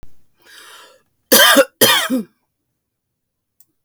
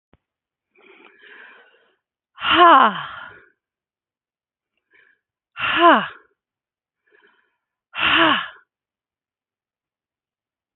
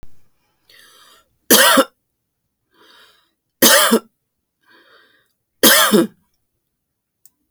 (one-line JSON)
{"cough_length": "3.8 s", "cough_amplitude": 32768, "cough_signal_mean_std_ratio": 0.36, "exhalation_length": "10.8 s", "exhalation_amplitude": 30298, "exhalation_signal_mean_std_ratio": 0.28, "three_cough_length": "7.5 s", "three_cough_amplitude": 32768, "three_cough_signal_mean_std_ratio": 0.32, "survey_phase": "beta (2021-08-13 to 2022-03-07)", "age": "65+", "gender": "Female", "wearing_mask": "No", "symptom_none": true, "smoker_status": "Ex-smoker", "respiratory_condition_asthma": false, "respiratory_condition_other": false, "recruitment_source": "REACT", "submission_delay": "2 days", "covid_test_result": "Negative", "covid_test_method": "RT-qPCR"}